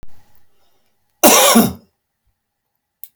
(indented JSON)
{
  "cough_length": "3.2 s",
  "cough_amplitude": 32768,
  "cough_signal_mean_std_ratio": 0.35,
  "survey_phase": "beta (2021-08-13 to 2022-03-07)",
  "age": "65+",
  "gender": "Male",
  "wearing_mask": "No",
  "symptom_runny_or_blocked_nose": true,
  "smoker_status": "Ex-smoker",
  "respiratory_condition_asthma": false,
  "respiratory_condition_other": false,
  "recruitment_source": "REACT",
  "submission_delay": "1 day",
  "covid_test_result": "Negative",
  "covid_test_method": "RT-qPCR"
}